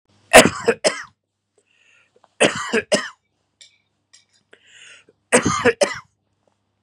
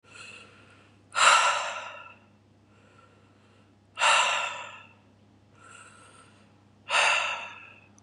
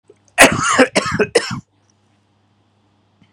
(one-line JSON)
{"three_cough_length": "6.8 s", "three_cough_amplitude": 32768, "three_cough_signal_mean_std_ratio": 0.3, "exhalation_length": "8.0 s", "exhalation_amplitude": 17090, "exhalation_signal_mean_std_ratio": 0.4, "cough_length": "3.3 s", "cough_amplitude": 32768, "cough_signal_mean_std_ratio": 0.38, "survey_phase": "beta (2021-08-13 to 2022-03-07)", "age": "45-64", "gender": "Male", "wearing_mask": "No", "symptom_fatigue": true, "smoker_status": "Ex-smoker", "respiratory_condition_asthma": false, "respiratory_condition_other": false, "recruitment_source": "REACT", "submission_delay": "3 days", "covid_test_result": "Negative", "covid_test_method": "RT-qPCR", "influenza_a_test_result": "Negative", "influenza_b_test_result": "Negative"}